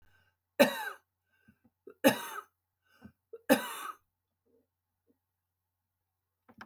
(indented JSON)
{
  "three_cough_length": "6.7 s",
  "three_cough_amplitude": 13425,
  "three_cough_signal_mean_std_ratio": 0.22,
  "survey_phase": "beta (2021-08-13 to 2022-03-07)",
  "age": "65+",
  "gender": "Female",
  "wearing_mask": "No",
  "symptom_none": true,
  "smoker_status": "Never smoked",
  "respiratory_condition_asthma": false,
  "respiratory_condition_other": false,
  "recruitment_source": "REACT",
  "submission_delay": "2 days",
  "covid_test_result": "Negative",
  "covid_test_method": "RT-qPCR",
  "influenza_a_test_result": "Negative",
  "influenza_b_test_result": "Negative"
}